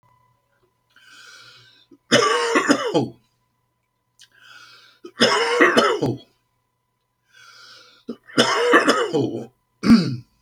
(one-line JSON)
{"three_cough_length": "10.4 s", "three_cough_amplitude": 32767, "three_cough_signal_mean_std_ratio": 0.45, "survey_phase": "beta (2021-08-13 to 2022-03-07)", "age": "65+", "gender": "Male", "wearing_mask": "No", "symptom_none": true, "smoker_status": "Never smoked", "respiratory_condition_asthma": false, "respiratory_condition_other": false, "recruitment_source": "REACT", "submission_delay": "3 days", "covid_test_result": "Negative", "covid_test_method": "RT-qPCR"}